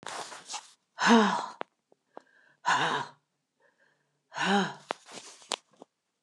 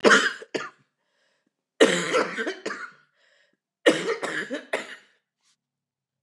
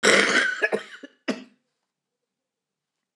exhalation_length: 6.2 s
exhalation_amplitude: 12465
exhalation_signal_mean_std_ratio: 0.37
three_cough_length: 6.2 s
three_cough_amplitude: 24710
three_cough_signal_mean_std_ratio: 0.37
cough_length: 3.2 s
cough_amplitude: 24446
cough_signal_mean_std_ratio: 0.39
survey_phase: beta (2021-08-13 to 2022-03-07)
age: 65+
gender: Female
wearing_mask: 'No'
symptom_cough_any: true
symptom_runny_or_blocked_nose: true
symptom_onset: 11 days
smoker_status: Never smoked
respiratory_condition_asthma: false
respiratory_condition_other: false
recruitment_source: REACT
submission_delay: 3 days
covid_test_result: Negative
covid_test_method: RT-qPCR
influenza_a_test_result: Negative
influenza_b_test_result: Negative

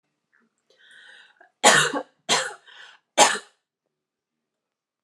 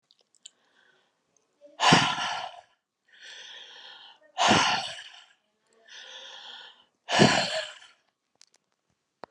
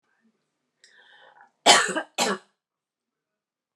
three_cough_length: 5.0 s
three_cough_amplitude: 30839
three_cough_signal_mean_std_ratio: 0.28
exhalation_length: 9.3 s
exhalation_amplitude: 18710
exhalation_signal_mean_std_ratio: 0.34
cough_length: 3.8 s
cough_amplitude: 31260
cough_signal_mean_std_ratio: 0.26
survey_phase: alpha (2021-03-01 to 2021-08-12)
age: 18-44
gender: Female
wearing_mask: 'No'
symptom_none: true
smoker_status: Current smoker (1 to 10 cigarettes per day)
respiratory_condition_asthma: false
respiratory_condition_other: false
recruitment_source: REACT
submission_delay: 1 day
covid_test_result: Negative
covid_test_method: RT-qPCR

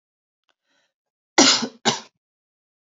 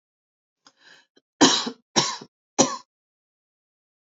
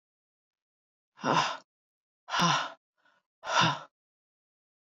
cough_length: 2.9 s
cough_amplitude: 32768
cough_signal_mean_std_ratio: 0.27
three_cough_length: 4.2 s
three_cough_amplitude: 26753
three_cough_signal_mean_std_ratio: 0.27
exhalation_length: 4.9 s
exhalation_amplitude: 8813
exhalation_signal_mean_std_ratio: 0.35
survey_phase: beta (2021-08-13 to 2022-03-07)
age: 45-64
gender: Female
wearing_mask: 'No'
symptom_cough_any: true
symptom_onset: 6 days
smoker_status: Never smoked
respiratory_condition_asthma: false
respiratory_condition_other: false
recruitment_source: Test and Trace
submission_delay: 2 days
covid_test_result: Positive
covid_test_method: RT-qPCR
covid_ct_value: 27.1
covid_ct_gene: ORF1ab gene
covid_ct_mean: 27.2
covid_viral_load: 1200 copies/ml
covid_viral_load_category: Minimal viral load (< 10K copies/ml)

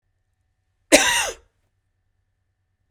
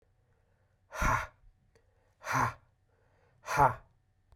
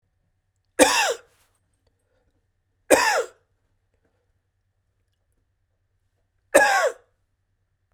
cough_length: 2.9 s
cough_amplitude: 32768
cough_signal_mean_std_ratio: 0.25
exhalation_length: 4.4 s
exhalation_amplitude: 9429
exhalation_signal_mean_std_ratio: 0.33
three_cough_length: 7.9 s
three_cough_amplitude: 32767
three_cough_signal_mean_std_ratio: 0.28
survey_phase: beta (2021-08-13 to 2022-03-07)
age: 45-64
gender: Male
wearing_mask: 'No'
symptom_cough_any: true
symptom_runny_or_blocked_nose: true
symptom_sore_throat: true
symptom_headache: true
smoker_status: Never smoked
respiratory_condition_asthma: false
respiratory_condition_other: false
recruitment_source: Test and Trace
submission_delay: 1 day
covid_test_result: Positive
covid_test_method: RT-qPCR
covid_ct_value: 23.8
covid_ct_gene: ORF1ab gene
covid_ct_mean: 24.5
covid_viral_load: 9100 copies/ml
covid_viral_load_category: Minimal viral load (< 10K copies/ml)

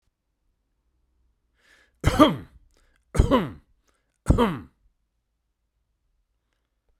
three_cough_length: 7.0 s
three_cough_amplitude: 32768
three_cough_signal_mean_std_ratio: 0.26
survey_phase: beta (2021-08-13 to 2022-03-07)
age: 65+
gender: Male
wearing_mask: 'No'
symptom_none: true
smoker_status: Never smoked
respiratory_condition_asthma: false
respiratory_condition_other: false
recruitment_source: REACT
submission_delay: 2 days
covid_test_result: Negative
covid_test_method: RT-qPCR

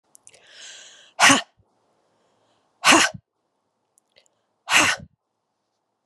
exhalation_length: 6.1 s
exhalation_amplitude: 29681
exhalation_signal_mean_std_ratio: 0.27
survey_phase: beta (2021-08-13 to 2022-03-07)
age: 45-64
gender: Female
wearing_mask: 'No'
symptom_cough_any: true
symptom_new_continuous_cough: true
symptom_runny_or_blocked_nose: true
symptom_shortness_of_breath: true
symptom_sore_throat: true
symptom_headache: true
symptom_onset: 3 days
smoker_status: Never smoked
respiratory_condition_asthma: false
respiratory_condition_other: false
recruitment_source: Test and Trace
submission_delay: 1 day
covid_test_result: Positive
covid_test_method: RT-qPCR
covid_ct_value: 23.1
covid_ct_gene: ORF1ab gene
covid_ct_mean: 23.9
covid_viral_load: 15000 copies/ml
covid_viral_load_category: Low viral load (10K-1M copies/ml)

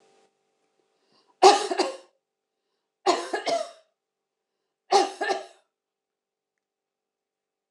three_cough_length: 7.7 s
three_cough_amplitude: 24894
three_cough_signal_mean_std_ratio: 0.27
survey_phase: beta (2021-08-13 to 2022-03-07)
age: 45-64
gender: Female
wearing_mask: 'No'
symptom_cough_any: true
symptom_runny_or_blocked_nose: true
symptom_shortness_of_breath: true
symptom_sore_throat: true
symptom_fatigue: true
symptom_onset: 2 days
smoker_status: Ex-smoker
respiratory_condition_asthma: false
respiratory_condition_other: false
recruitment_source: Test and Trace
submission_delay: 2 days
covid_test_result: Positive
covid_test_method: RT-qPCR
covid_ct_value: 17.6
covid_ct_gene: ORF1ab gene
covid_ct_mean: 17.8
covid_viral_load: 1500000 copies/ml
covid_viral_load_category: High viral load (>1M copies/ml)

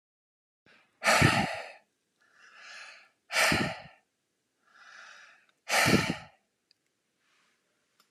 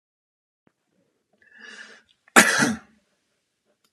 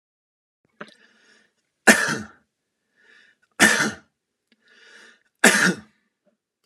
exhalation_length: 8.1 s
exhalation_amplitude: 13152
exhalation_signal_mean_std_ratio: 0.34
cough_length: 3.9 s
cough_amplitude: 32767
cough_signal_mean_std_ratio: 0.23
three_cough_length: 6.7 s
three_cough_amplitude: 32612
three_cough_signal_mean_std_ratio: 0.27
survey_phase: alpha (2021-03-01 to 2021-08-12)
age: 45-64
gender: Male
wearing_mask: 'No'
symptom_none: true
smoker_status: Never smoked
respiratory_condition_asthma: false
respiratory_condition_other: false
recruitment_source: REACT
submission_delay: 1 day
covid_test_result: Negative
covid_test_method: RT-qPCR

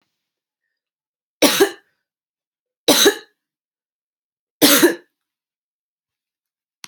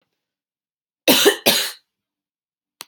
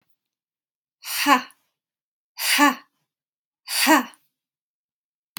three_cough_length: 6.9 s
three_cough_amplitude: 32768
three_cough_signal_mean_std_ratio: 0.27
cough_length: 2.9 s
cough_amplitude: 32768
cough_signal_mean_std_ratio: 0.32
exhalation_length: 5.4 s
exhalation_amplitude: 25422
exhalation_signal_mean_std_ratio: 0.32
survey_phase: alpha (2021-03-01 to 2021-08-12)
age: 18-44
gender: Female
wearing_mask: 'No'
symptom_shortness_of_breath: true
symptom_diarrhoea: true
symptom_fatigue: true
symptom_headache: true
smoker_status: Never smoked
respiratory_condition_asthma: false
respiratory_condition_other: false
recruitment_source: Test and Trace
submission_delay: 2 days
covid_test_result: Positive
covid_test_method: RT-qPCR
covid_ct_value: 20.4
covid_ct_gene: N gene
covid_ct_mean: 20.7
covid_viral_load: 160000 copies/ml
covid_viral_load_category: Low viral load (10K-1M copies/ml)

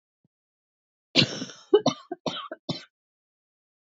cough_length: 3.9 s
cough_amplitude: 20457
cough_signal_mean_std_ratio: 0.27
survey_phase: beta (2021-08-13 to 2022-03-07)
age: 18-44
gender: Female
wearing_mask: 'No'
symptom_cough_any: true
symptom_shortness_of_breath: true
symptom_sore_throat: true
symptom_abdominal_pain: true
symptom_diarrhoea: true
symptom_fatigue: true
symptom_headache: true
symptom_onset: 4 days
smoker_status: Never smoked
respiratory_condition_asthma: false
respiratory_condition_other: false
recruitment_source: Test and Trace
submission_delay: 2 days
covid_test_result: Positive
covid_test_method: RT-qPCR
covid_ct_value: 26.6
covid_ct_gene: ORF1ab gene
covid_ct_mean: 27.0
covid_viral_load: 1400 copies/ml
covid_viral_load_category: Minimal viral load (< 10K copies/ml)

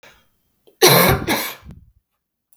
cough_length: 2.6 s
cough_amplitude: 32768
cough_signal_mean_std_ratio: 0.38
survey_phase: beta (2021-08-13 to 2022-03-07)
age: 45-64
gender: Female
wearing_mask: 'No'
symptom_cough_any: true
symptom_new_continuous_cough: true
symptom_runny_or_blocked_nose: true
symptom_abdominal_pain: true
symptom_fatigue: true
symptom_fever_high_temperature: true
symptom_headache: true
symptom_onset: 3 days
smoker_status: Never smoked
respiratory_condition_asthma: false
respiratory_condition_other: false
recruitment_source: Test and Trace
submission_delay: 1 day
covid_test_result: Positive
covid_test_method: RT-qPCR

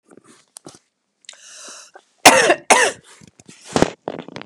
cough_length: 4.5 s
cough_amplitude: 32768
cough_signal_mean_std_ratio: 0.3
survey_phase: beta (2021-08-13 to 2022-03-07)
age: 18-44
gender: Female
wearing_mask: 'No'
symptom_cough_any: true
symptom_runny_or_blocked_nose: true
symptom_sore_throat: true
symptom_fatigue: true
symptom_headache: true
symptom_onset: 5 days
smoker_status: Never smoked
respiratory_condition_asthma: true
respiratory_condition_other: false
recruitment_source: Test and Trace
submission_delay: 1 day
covid_test_result: Positive
covid_test_method: RT-qPCR
covid_ct_value: 20.1
covid_ct_gene: N gene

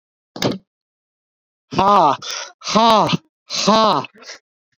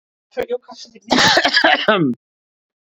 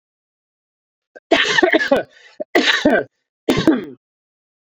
exhalation_length: 4.8 s
exhalation_amplitude: 27825
exhalation_signal_mean_std_ratio: 0.45
cough_length: 2.9 s
cough_amplitude: 28411
cough_signal_mean_std_ratio: 0.52
three_cough_length: 4.6 s
three_cough_amplitude: 32768
three_cough_signal_mean_std_ratio: 0.45
survey_phase: beta (2021-08-13 to 2022-03-07)
age: 18-44
gender: Male
wearing_mask: 'No'
symptom_none: true
smoker_status: Never smoked
respiratory_condition_asthma: false
respiratory_condition_other: false
recruitment_source: REACT
submission_delay: 1 day
covid_test_result: Negative
covid_test_method: RT-qPCR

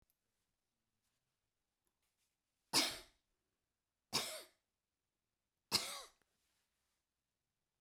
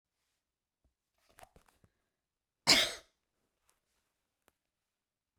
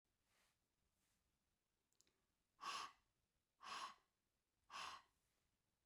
three_cough_length: 7.8 s
three_cough_amplitude: 3369
three_cough_signal_mean_std_ratio: 0.21
cough_length: 5.4 s
cough_amplitude: 11707
cough_signal_mean_std_ratio: 0.16
exhalation_length: 5.9 s
exhalation_amplitude: 356
exhalation_signal_mean_std_ratio: 0.33
survey_phase: beta (2021-08-13 to 2022-03-07)
age: 65+
gender: Female
wearing_mask: 'No'
symptom_none: true
smoker_status: Never smoked
respiratory_condition_asthma: false
respiratory_condition_other: false
recruitment_source: REACT
submission_delay: 3 days
covid_test_result: Negative
covid_test_method: RT-qPCR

